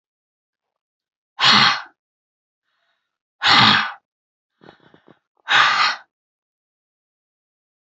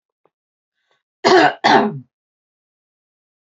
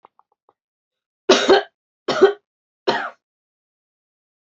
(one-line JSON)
{"exhalation_length": "7.9 s", "exhalation_amplitude": 30356, "exhalation_signal_mean_std_ratio": 0.32, "cough_length": "3.4 s", "cough_amplitude": 32767, "cough_signal_mean_std_ratio": 0.33, "three_cough_length": "4.4 s", "three_cough_amplitude": 29613, "three_cough_signal_mean_std_ratio": 0.29, "survey_phase": "beta (2021-08-13 to 2022-03-07)", "age": "18-44", "gender": "Female", "wearing_mask": "No", "symptom_none": true, "smoker_status": "Ex-smoker", "respiratory_condition_asthma": false, "respiratory_condition_other": false, "recruitment_source": "Test and Trace", "submission_delay": "1 day", "covid_test_method": "RT-qPCR", "covid_ct_value": 34.4, "covid_ct_gene": "ORF1ab gene"}